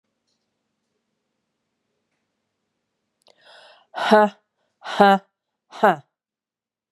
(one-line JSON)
{"exhalation_length": "6.9 s", "exhalation_amplitude": 32766, "exhalation_signal_mean_std_ratio": 0.23, "survey_phase": "beta (2021-08-13 to 2022-03-07)", "age": "45-64", "gender": "Female", "wearing_mask": "No", "symptom_cough_any": true, "symptom_runny_or_blocked_nose": true, "symptom_sore_throat": true, "symptom_fatigue": true, "symptom_headache": true, "symptom_other": true, "symptom_onset": "4 days", "smoker_status": "Never smoked", "respiratory_condition_asthma": false, "respiratory_condition_other": false, "recruitment_source": "Test and Trace", "submission_delay": "2 days", "covid_test_result": "Positive", "covid_test_method": "RT-qPCR", "covid_ct_value": 29.8, "covid_ct_gene": "ORF1ab gene", "covid_ct_mean": 30.3, "covid_viral_load": "120 copies/ml", "covid_viral_load_category": "Minimal viral load (< 10K copies/ml)"}